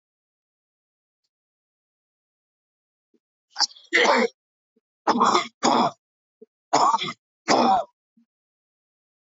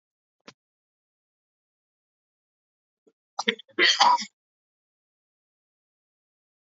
three_cough_length: 9.4 s
three_cough_amplitude: 21276
three_cough_signal_mean_std_ratio: 0.35
cough_length: 6.7 s
cough_amplitude: 22526
cough_signal_mean_std_ratio: 0.21
survey_phase: beta (2021-08-13 to 2022-03-07)
age: 45-64
gender: Male
wearing_mask: 'No'
symptom_cough_any: true
symptom_runny_or_blocked_nose: true
symptom_shortness_of_breath: true
symptom_sore_throat: true
symptom_abdominal_pain: true
symptom_fatigue: true
symptom_fever_high_temperature: true
symptom_headache: true
symptom_change_to_sense_of_smell_or_taste: true
symptom_loss_of_taste: true
symptom_onset: 3 days
smoker_status: Never smoked
respiratory_condition_asthma: false
respiratory_condition_other: false
recruitment_source: Test and Trace
submission_delay: 1 day
covid_test_result: Positive
covid_test_method: RT-qPCR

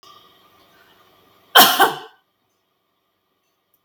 cough_length: 3.8 s
cough_amplitude: 32768
cough_signal_mean_std_ratio: 0.24
survey_phase: beta (2021-08-13 to 2022-03-07)
age: 45-64
gender: Female
wearing_mask: 'No'
symptom_none: true
smoker_status: Never smoked
respiratory_condition_asthma: false
respiratory_condition_other: false
recruitment_source: REACT
submission_delay: 1 day
covid_test_result: Negative
covid_test_method: RT-qPCR
influenza_a_test_result: Negative
influenza_b_test_result: Negative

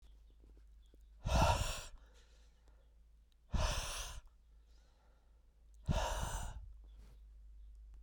exhalation_length: 8.0 s
exhalation_amplitude: 3839
exhalation_signal_mean_std_ratio: 0.45
survey_phase: beta (2021-08-13 to 2022-03-07)
age: 45-64
gender: Male
wearing_mask: 'No'
symptom_cough_any: true
symptom_runny_or_blocked_nose: true
symptom_sore_throat: true
symptom_fever_high_temperature: true
symptom_headache: true
symptom_onset: 4 days
smoker_status: Never smoked
respiratory_condition_asthma: false
respiratory_condition_other: false
recruitment_source: Test and Trace
submission_delay: 2 days
covid_test_result: Positive
covid_test_method: RT-qPCR
covid_ct_value: 19.3
covid_ct_gene: ORF1ab gene
covid_ct_mean: 19.5
covid_viral_load: 400000 copies/ml
covid_viral_load_category: Low viral load (10K-1M copies/ml)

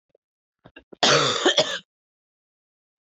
cough_length: 3.1 s
cough_amplitude: 19714
cough_signal_mean_std_ratio: 0.37
survey_phase: beta (2021-08-13 to 2022-03-07)
age: 18-44
gender: Female
wearing_mask: 'No'
symptom_cough_any: true
symptom_runny_or_blocked_nose: true
symptom_sore_throat: true
symptom_fatigue: true
symptom_headache: true
symptom_change_to_sense_of_smell_or_taste: true
symptom_loss_of_taste: true
symptom_onset: 12 days
smoker_status: Never smoked
respiratory_condition_asthma: false
respiratory_condition_other: false
recruitment_source: REACT
submission_delay: 2 days
covid_test_result: Negative
covid_test_method: RT-qPCR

